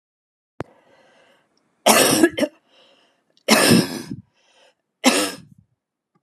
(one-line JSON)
{"three_cough_length": "6.2 s", "three_cough_amplitude": 32411, "three_cough_signal_mean_std_ratio": 0.36, "survey_phase": "alpha (2021-03-01 to 2021-08-12)", "age": "65+", "gender": "Female", "wearing_mask": "No", "symptom_none": true, "smoker_status": "Never smoked", "respiratory_condition_asthma": false, "respiratory_condition_other": false, "recruitment_source": "REACT", "submission_delay": "1 day", "covid_test_result": "Negative", "covid_test_method": "RT-qPCR"}